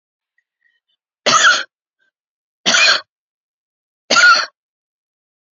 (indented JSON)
{
  "three_cough_length": "5.5 s",
  "three_cough_amplitude": 31110,
  "three_cough_signal_mean_std_ratio": 0.35,
  "survey_phase": "beta (2021-08-13 to 2022-03-07)",
  "age": "45-64",
  "gender": "Female",
  "wearing_mask": "No",
  "symptom_cough_any": true,
  "symptom_runny_or_blocked_nose": true,
  "symptom_fatigue": true,
  "symptom_headache": true,
  "symptom_onset": "7 days",
  "smoker_status": "Ex-smoker",
  "respiratory_condition_asthma": false,
  "respiratory_condition_other": false,
  "recruitment_source": "Test and Trace",
  "submission_delay": "1 day",
  "covid_test_result": "Positive",
  "covid_test_method": "RT-qPCR",
  "covid_ct_value": 26.6,
  "covid_ct_gene": "N gene",
  "covid_ct_mean": 26.8,
  "covid_viral_load": "1600 copies/ml",
  "covid_viral_load_category": "Minimal viral load (< 10K copies/ml)"
}